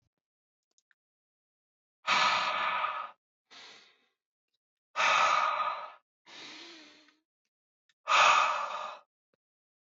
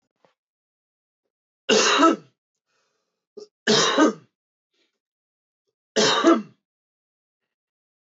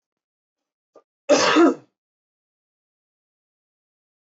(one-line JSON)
{"exhalation_length": "10.0 s", "exhalation_amplitude": 10255, "exhalation_signal_mean_std_ratio": 0.41, "three_cough_length": "8.2 s", "three_cough_amplitude": 18540, "three_cough_signal_mean_std_ratio": 0.33, "cough_length": "4.4 s", "cough_amplitude": 19841, "cough_signal_mean_std_ratio": 0.26, "survey_phase": "beta (2021-08-13 to 2022-03-07)", "age": "18-44", "gender": "Male", "wearing_mask": "No", "symptom_cough_any": true, "symptom_runny_or_blocked_nose": true, "symptom_onset": "4 days", "smoker_status": "Ex-smoker", "respiratory_condition_asthma": false, "respiratory_condition_other": false, "recruitment_source": "Test and Trace", "submission_delay": "2 days", "covid_test_result": "Positive", "covid_test_method": "RT-qPCR", "covid_ct_value": 21.9, "covid_ct_gene": "S gene", "covid_ct_mean": 22.2, "covid_viral_load": "52000 copies/ml", "covid_viral_load_category": "Low viral load (10K-1M copies/ml)"}